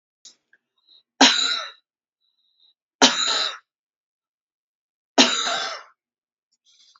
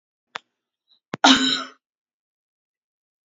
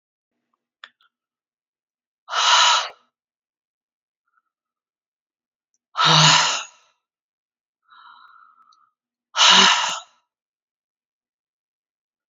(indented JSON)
{
  "three_cough_length": "7.0 s",
  "three_cough_amplitude": 31920,
  "three_cough_signal_mean_std_ratio": 0.32,
  "cough_length": "3.2 s",
  "cough_amplitude": 29733,
  "cough_signal_mean_std_ratio": 0.25,
  "exhalation_length": "12.3 s",
  "exhalation_amplitude": 29223,
  "exhalation_signal_mean_std_ratio": 0.3,
  "survey_phase": "beta (2021-08-13 to 2022-03-07)",
  "age": "45-64",
  "gender": "Female",
  "wearing_mask": "No",
  "symptom_cough_any": true,
  "symptom_shortness_of_breath": true,
  "symptom_sore_throat": true,
  "symptom_onset": "3 days",
  "smoker_status": "Ex-smoker",
  "respiratory_condition_asthma": true,
  "respiratory_condition_other": false,
  "recruitment_source": "Test and Trace",
  "submission_delay": "2 days",
  "covid_test_result": "Positive",
  "covid_test_method": "RT-qPCR",
  "covid_ct_value": 24.9,
  "covid_ct_gene": "ORF1ab gene",
  "covid_ct_mean": 25.2,
  "covid_viral_load": "5500 copies/ml",
  "covid_viral_load_category": "Minimal viral load (< 10K copies/ml)"
}